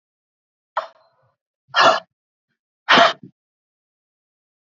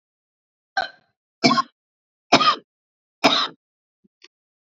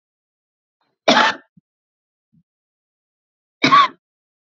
{"exhalation_length": "4.6 s", "exhalation_amplitude": 27850, "exhalation_signal_mean_std_ratio": 0.26, "three_cough_length": "4.6 s", "three_cough_amplitude": 29369, "three_cough_signal_mean_std_ratio": 0.3, "cough_length": "4.4 s", "cough_amplitude": 30697, "cough_signal_mean_std_ratio": 0.26, "survey_phase": "beta (2021-08-13 to 2022-03-07)", "age": "45-64", "gender": "Female", "wearing_mask": "No", "symptom_cough_any": true, "symptom_runny_or_blocked_nose": true, "symptom_sore_throat": true, "symptom_headache": true, "smoker_status": "Current smoker (1 to 10 cigarettes per day)", "respiratory_condition_asthma": true, "respiratory_condition_other": false, "recruitment_source": "Test and Trace", "submission_delay": "-1 day", "covid_test_result": "Negative", "covid_test_method": "RT-qPCR"}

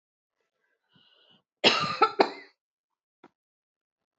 {"cough_length": "4.2 s", "cough_amplitude": 22524, "cough_signal_mean_std_ratio": 0.24, "survey_phase": "beta (2021-08-13 to 2022-03-07)", "age": "45-64", "gender": "Female", "wearing_mask": "No", "symptom_cough_any": true, "symptom_runny_or_blocked_nose": true, "symptom_onset": "4 days", "smoker_status": "Never smoked", "respiratory_condition_asthma": false, "respiratory_condition_other": false, "recruitment_source": "Test and Trace", "submission_delay": "2 days", "covid_test_result": "Positive", "covid_test_method": "RT-qPCR", "covid_ct_value": 17.1, "covid_ct_gene": "ORF1ab gene"}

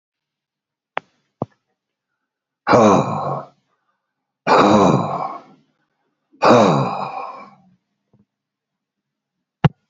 {"exhalation_length": "9.9 s", "exhalation_amplitude": 29419, "exhalation_signal_mean_std_ratio": 0.36, "survey_phase": "beta (2021-08-13 to 2022-03-07)", "age": "45-64", "gender": "Male", "wearing_mask": "No", "symptom_cough_any": true, "symptom_fatigue": true, "smoker_status": "Current smoker (11 or more cigarettes per day)", "respiratory_condition_asthma": false, "respiratory_condition_other": true, "recruitment_source": "Test and Trace", "submission_delay": "1 day", "covid_test_result": "Positive", "covid_test_method": "RT-qPCR"}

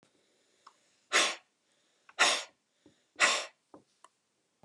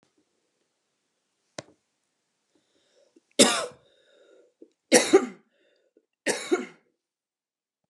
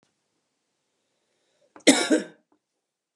{"exhalation_length": "4.6 s", "exhalation_amplitude": 10193, "exhalation_signal_mean_std_ratio": 0.3, "three_cough_length": "7.9 s", "three_cough_amplitude": 26751, "three_cough_signal_mean_std_ratio": 0.22, "cough_length": "3.2 s", "cough_amplitude": 26838, "cough_signal_mean_std_ratio": 0.23, "survey_phase": "beta (2021-08-13 to 2022-03-07)", "age": "45-64", "gender": "Female", "wearing_mask": "No", "symptom_runny_or_blocked_nose": true, "symptom_headache": true, "symptom_onset": "6 days", "smoker_status": "Ex-smoker", "respiratory_condition_asthma": true, "respiratory_condition_other": false, "recruitment_source": "REACT", "submission_delay": "2 days", "covid_test_result": "Negative", "covid_test_method": "RT-qPCR"}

